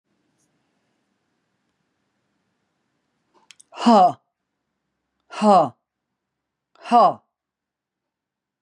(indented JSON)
{
  "exhalation_length": "8.6 s",
  "exhalation_amplitude": 25904,
  "exhalation_signal_mean_std_ratio": 0.25,
  "survey_phase": "beta (2021-08-13 to 2022-03-07)",
  "age": "65+",
  "gender": "Female",
  "wearing_mask": "No",
  "symptom_none": true,
  "smoker_status": "Never smoked",
  "respiratory_condition_asthma": false,
  "respiratory_condition_other": false,
  "recruitment_source": "REACT",
  "submission_delay": "1 day",
  "covid_test_result": "Negative",
  "covid_test_method": "RT-qPCR",
  "influenza_a_test_result": "Negative",
  "influenza_b_test_result": "Negative"
}